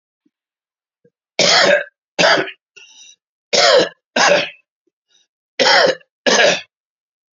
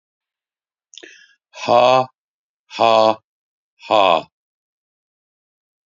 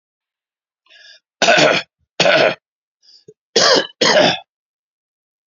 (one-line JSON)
{"three_cough_length": "7.3 s", "three_cough_amplitude": 32052, "three_cough_signal_mean_std_ratio": 0.45, "exhalation_length": "5.9 s", "exhalation_amplitude": 29930, "exhalation_signal_mean_std_ratio": 0.31, "cough_length": "5.5 s", "cough_amplitude": 32767, "cough_signal_mean_std_ratio": 0.42, "survey_phase": "beta (2021-08-13 to 2022-03-07)", "age": "65+", "gender": "Male", "wearing_mask": "No", "symptom_none": true, "smoker_status": "Never smoked", "respiratory_condition_asthma": false, "respiratory_condition_other": false, "recruitment_source": "REACT", "submission_delay": "1 day", "covid_test_result": "Negative", "covid_test_method": "RT-qPCR", "influenza_a_test_result": "Negative", "influenza_b_test_result": "Negative"}